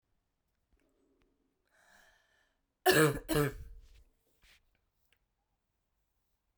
cough_length: 6.6 s
cough_amplitude: 7732
cough_signal_mean_std_ratio: 0.24
survey_phase: beta (2021-08-13 to 2022-03-07)
age: 45-64
gender: Female
wearing_mask: 'No'
symptom_cough_any: true
symptom_runny_or_blocked_nose: true
symptom_shortness_of_breath: true
symptom_fatigue: true
symptom_headache: true
symptom_change_to_sense_of_smell_or_taste: true
symptom_loss_of_taste: true
symptom_onset: 5 days
smoker_status: Current smoker (1 to 10 cigarettes per day)
respiratory_condition_asthma: false
respiratory_condition_other: false
recruitment_source: Test and Trace
submission_delay: 1 day
covid_test_result: Positive
covid_test_method: RT-qPCR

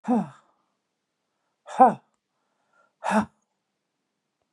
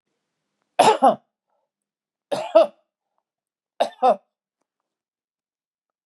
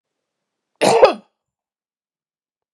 exhalation_length: 4.5 s
exhalation_amplitude: 22782
exhalation_signal_mean_std_ratio: 0.25
three_cough_length: 6.1 s
three_cough_amplitude: 28259
three_cough_signal_mean_std_ratio: 0.26
cough_length: 2.7 s
cough_amplitude: 32768
cough_signal_mean_std_ratio: 0.25
survey_phase: beta (2021-08-13 to 2022-03-07)
age: 45-64
gender: Female
wearing_mask: 'No'
symptom_none: true
symptom_onset: 3 days
smoker_status: Never smoked
respiratory_condition_asthma: false
respiratory_condition_other: false
recruitment_source: REACT
submission_delay: 2 days
covid_test_result: Negative
covid_test_method: RT-qPCR
influenza_a_test_result: Negative
influenza_b_test_result: Negative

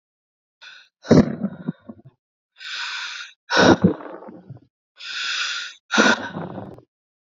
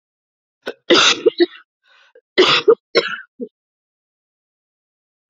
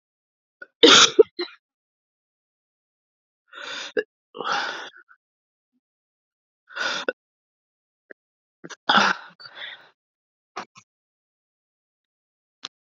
exhalation_length: 7.3 s
exhalation_amplitude: 29800
exhalation_signal_mean_std_ratio: 0.38
cough_length: 5.3 s
cough_amplitude: 30879
cough_signal_mean_std_ratio: 0.33
three_cough_length: 12.9 s
three_cough_amplitude: 31222
three_cough_signal_mean_std_ratio: 0.22
survey_phase: alpha (2021-03-01 to 2021-08-12)
age: 18-44
gender: Female
wearing_mask: 'No'
symptom_cough_any: true
symptom_new_continuous_cough: true
symptom_shortness_of_breath: true
symptom_abdominal_pain: true
symptom_fatigue: true
symptom_headache: true
symptom_change_to_sense_of_smell_or_taste: true
symptom_loss_of_taste: true
smoker_status: Current smoker (1 to 10 cigarettes per day)
respiratory_condition_asthma: false
respiratory_condition_other: false
recruitment_source: Test and Trace
submission_delay: 2 days
covid_test_result: Positive
covid_test_method: LFT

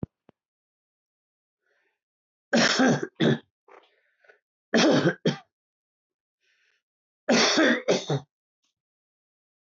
three_cough_length: 9.6 s
three_cough_amplitude: 13870
three_cough_signal_mean_std_ratio: 0.36
survey_phase: alpha (2021-03-01 to 2021-08-12)
age: 65+
gender: Male
wearing_mask: 'No'
symptom_none: true
smoker_status: Never smoked
respiratory_condition_asthma: false
respiratory_condition_other: false
recruitment_source: REACT
submission_delay: 2 days
covid_test_result: Negative
covid_test_method: RT-qPCR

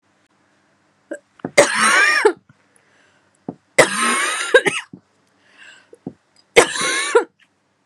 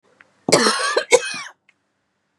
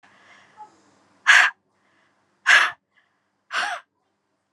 three_cough_length: 7.9 s
three_cough_amplitude: 32768
three_cough_signal_mean_std_ratio: 0.4
cough_length: 2.4 s
cough_amplitude: 32768
cough_signal_mean_std_ratio: 0.41
exhalation_length: 4.5 s
exhalation_amplitude: 27904
exhalation_signal_mean_std_ratio: 0.29
survey_phase: beta (2021-08-13 to 2022-03-07)
age: 18-44
gender: Female
wearing_mask: 'No'
symptom_runny_or_blocked_nose: true
symptom_shortness_of_breath: true
symptom_fatigue: true
symptom_headache: true
smoker_status: Ex-smoker
respiratory_condition_asthma: false
respiratory_condition_other: false
recruitment_source: Test and Trace
submission_delay: 2 days
covid_test_result: Positive
covid_test_method: RT-qPCR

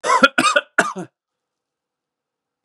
three_cough_length: 2.6 s
three_cough_amplitude: 32768
three_cough_signal_mean_std_ratio: 0.35
survey_phase: beta (2021-08-13 to 2022-03-07)
age: 18-44
gender: Male
wearing_mask: 'Yes'
symptom_cough_any: true
symptom_new_continuous_cough: true
symptom_sore_throat: true
symptom_fatigue: true
symptom_headache: true
symptom_onset: 6 days
smoker_status: Never smoked
respiratory_condition_asthma: false
respiratory_condition_other: false
recruitment_source: Test and Trace
submission_delay: 2 days
covid_test_result: Positive
covid_test_method: ePCR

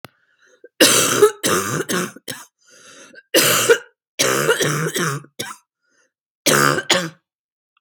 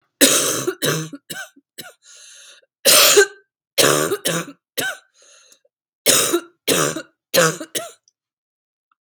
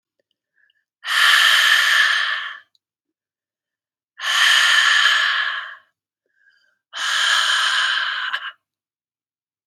cough_length: 7.8 s
cough_amplitude: 32768
cough_signal_mean_std_ratio: 0.5
three_cough_length: 9.0 s
three_cough_amplitude: 32768
three_cough_signal_mean_std_ratio: 0.44
exhalation_length: 9.7 s
exhalation_amplitude: 27012
exhalation_signal_mean_std_ratio: 0.58
survey_phase: beta (2021-08-13 to 2022-03-07)
age: 45-64
gender: Female
wearing_mask: 'No'
symptom_cough_any: true
symptom_runny_or_blocked_nose: true
symptom_shortness_of_breath: true
symptom_sore_throat: true
symptom_abdominal_pain: true
symptom_fatigue: true
symptom_fever_high_temperature: true
symptom_headache: true
symptom_change_to_sense_of_smell_or_taste: true
symptom_onset: 6 days
smoker_status: Never smoked
respiratory_condition_asthma: false
respiratory_condition_other: false
recruitment_source: Test and Trace
submission_delay: 1 day
covid_test_result: Positive
covid_test_method: RT-qPCR
covid_ct_value: 22.9
covid_ct_gene: ORF1ab gene
covid_ct_mean: 23.1
covid_viral_load: 26000 copies/ml
covid_viral_load_category: Low viral load (10K-1M copies/ml)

